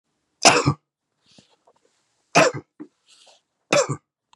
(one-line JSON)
{"three_cough_length": "4.4 s", "three_cough_amplitude": 31968, "three_cough_signal_mean_std_ratio": 0.29, "survey_phase": "beta (2021-08-13 to 2022-03-07)", "age": "45-64", "gender": "Male", "wearing_mask": "No", "symptom_new_continuous_cough": true, "symptom_runny_or_blocked_nose": true, "symptom_onset": "7 days", "smoker_status": "Never smoked", "respiratory_condition_asthma": false, "respiratory_condition_other": false, "recruitment_source": "Test and Trace", "submission_delay": "1 day", "covid_test_result": "Positive", "covid_test_method": "RT-qPCR", "covid_ct_value": 19.0, "covid_ct_gene": "ORF1ab gene"}